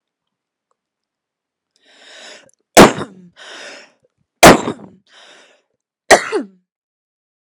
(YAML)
three_cough_length: 7.4 s
three_cough_amplitude: 32768
three_cough_signal_mean_std_ratio: 0.23
survey_phase: beta (2021-08-13 to 2022-03-07)
age: 18-44
gender: Female
wearing_mask: 'No'
symptom_cough_any: true
symptom_onset: 3 days
smoker_status: Ex-smoker
respiratory_condition_asthma: false
respiratory_condition_other: false
recruitment_source: REACT
submission_delay: 1 day
covid_test_result: Negative
covid_test_method: RT-qPCR